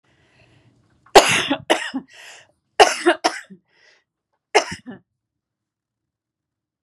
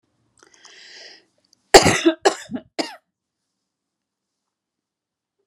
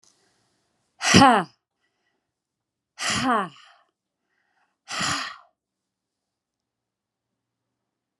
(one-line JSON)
{"three_cough_length": "6.8 s", "three_cough_amplitude": 32768, "three_cough_signal_mean_std_ratio": 0.27, "cough_length": "5.5 s", "cough_amplitude": 32768, "cough_signal_mean_std_ratio": 0.21, "exhalation_length": "8.2 s", "exhalation_amplitude": 31517, "exhalation_signal_mean_std_ratio": 0.25, "survey_phase": "beta (2021-08-13 to 2022-03-07)", "age": "45-64", "gender": "Female", "wearing_mask": "No", "symptom_cough_any": true, "symptom_fatigue": true, "symptom_fever_high_temperature": true, "symptom_change_to_sense_of_smell_or_taste": true, "symptom_loss_of_taste": true, "symptom_other": true, "symptom_onset": "5 days", "smoker_status": "Never smoked", "respiratory_condition_asthma": true, "respiratory_condition_other": false, "recruitment_source": "Test and Trace", "submission_delay": "1 day", "covid_test_result": "Positive", "covid_test_method": "RT-qPCR", "covid_ct_value": 18.8, "covid_ct_gene": "ORF1ab gene", "covid_ct_mean": 19.3, "covid_viral_load": "480000 copies/ml", "covid_viral_load_category": "Low viral load (10K-1M copies/ml)"}